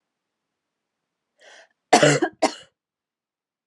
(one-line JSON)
{"cough_length": "3.7 s", "cough_amplitude": 31481, "cough_signal_mean_std_ratio": 0.25, "survey_phase": "alpha (2021-03-01 to 2021-08-12)", "age": "18-44", "gender": "Female", "wearing_mask": "No", "symptom_cough_any": true, "symptom_fatigue": true, "symptom_headache": true, "symptom_change_to_sense_of_smell_or_taste": true, "smoker_status": "Never smoked", "respiratory_condition_asthma": false, "respiratory_condition_other": false, "recruitment_source": "Test and Trace", "submission_delay": "3 days", "covid_test_result": "Positive", "covid_test_method": "RT-qPCR", "covid_ct_value": 17.7, "covid_ct_gene": "ORF1ab gene", "covid_ct_mean": 18.2, "covid_viral_load": "1100000 copies/ml", "covid_viral_load_category": "High viral load (>1M copies/ml)"}